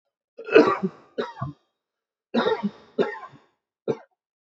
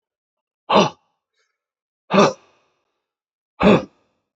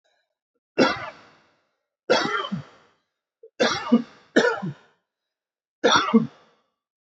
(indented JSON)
{
  "cough_length": "4.4 s",
  "cough_amplitude": 27419,
  "cough_signal_mean_std_ratio": 0.34,
  "exhalation_length": "4.4 s",
  "exhalation_amplitude": 26959,
  "exhalation_signal_mean_std_ratio": 0.29,
  "three_cough_length": "7.1 s",
  "three_cough_amplitude": 21743,
  "three_cough_signal_mean_std_ratio": 0.37,
  "survey_phase": "beta (2021-08-13 to 2022-03-07)",
  "age": "18-44",
  "gender": "Male",
  "wearing_mask": "No",
  "symptom_runny_or_blocked_nose": true,
  "smoker_status": "Current smoker (1 to 10 cigarettes per day)",
  "respiratory_condition_asthma": false,
  "respiratory_condition_other": false,
  "recruitment_source": "Test and Trace",
  "submission_delay": "2 days",
  "covid_test_result": "Positive",
  "covid_test_method": "RT-qPCR",
  "covid_ct_value": 32.5,
  "covid_ct_gene": "N gene"
}